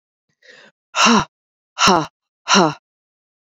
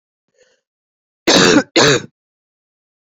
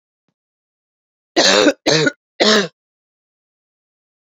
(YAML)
exhalation_length: 3.6 s
exhalation_amplitude: 30589
exhalation_signal_mean_std_ratio: 0.36
cough_length: 3.2 s
cough_amplitude: 30534
cough_signal_mean_std_ratio: 0.36
three_cough_length: 4.4 s
three_cough_amplitude: 32768
three_cough_signal_mean_std_ratio: 0.36
survey_phase: beta (2021-08-13 to 2022-03-07)
age: 45-64
gender: Female
wearing_mask: 'No'
symptom_cough_any: true
symptom_new_continuous_cough: true
symptom_runny_or_blocked_nose: true
symptom_other: true
symptom_onset: 3 days
smoker_status: Never smoked
respiratory_condition_asthma: false
respiratory_condition_other: false
recruitment_source: Test and Trace
submission_delay: 2 days
covid_test_result: Positive
covid_test_method: RT-qPCR
covid_ct_value: 32.7
covid_ct_gene: N gene